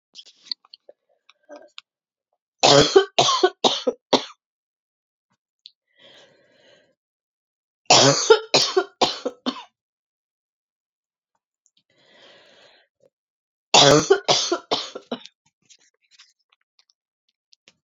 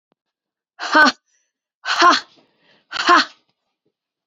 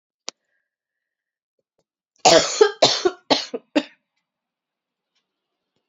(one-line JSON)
{"three_cough_length": "17.8 s", "three_cough_amplitude": 30559, "three_cough_signal_mean_std_ratio": 0.29, "exhalation_length": "4.3 s", "exhalation_amplitude": 30816, "exhalation_signal_mean_std_ratio": 0.34, "cough_length": "5.9 s", "cough_amplitude": 30497, "cough_signal_mean_std_ratio": 0.27, "survey_phase": "beta (2021-08-13 to 2022-03-07)", "age": "45-64", "gender": "Female", "wearing_mask": "No", "symptom_cough_any": true, "symptom_runny_or_blocked_nose": true, "symptom_sore_throat": true, "symptom_fatigue": true, "symptom_headache": true, "symptom_onset": "5 days", "smoker_status": "Ex-smoker", "respiratory_condition_asthma": false, "respiratory_condition_other": false, "recruitment_source": "Test and Trace", "submission_delay": "2 days", "covid_test_result": "Positive", "covid_test_method": "RT-qPCR", "covid_ct_value": 19.5, "covid_ct_gene": "ORF1ab gene", "covid_ct_mean": 19.9, "covid_viral_load": "300000 copies/ml", "covid_viral_load_category": "Low viral load (10K-1M copies/ml)"}